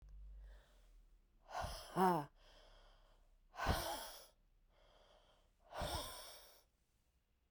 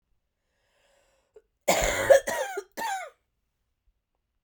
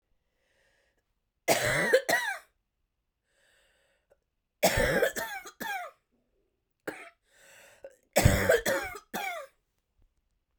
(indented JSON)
{
  "exhalation_length": "7.5 s",
  "exhalation_amplitude": 2272,
  "exhalation_signal_mean_std_ratio": 0.4,
  "cough_length": "4.4 s",
  "cough_amplitude": 15807,
  "cough_signal_mean_std_ratio": 0.32,
  "three_cough_length": "10.6 s",
  "three_cough_amplitude": 16014,
  "three_cough_signal_mean_std_ratio": 0.38,
  "survey_phase": "beta (2021-08-13 to 2022-03-07)",
  "age": "45-64",
  "gender": "Female",
  "wearing_mask": "No",
  "symptom_cough_any": true,
  "symptom_new_continuous_cough": true,
  "symptom_runny_or_blocked_nose": true,
  "symptom_shortness_of_breath": true,
  "symptom_fatigue": true,
  "symptom_headache": true,
  "symptom_change_to_sense_of_smell_or_taste": true,
  "symptom_loss_of_taste": true,
  "symptom_onset": "5 days",
  "smoker_status": "Never smoked",
  "respiratory_condition_asthma": false,
  "respiratory_condition_other": false,
  "recruitment_source": "Test and Trace",
  "submission_delay": "1 day",
  "covid_test_result": "Positive",
  "covid_test_method": "ePCR"
}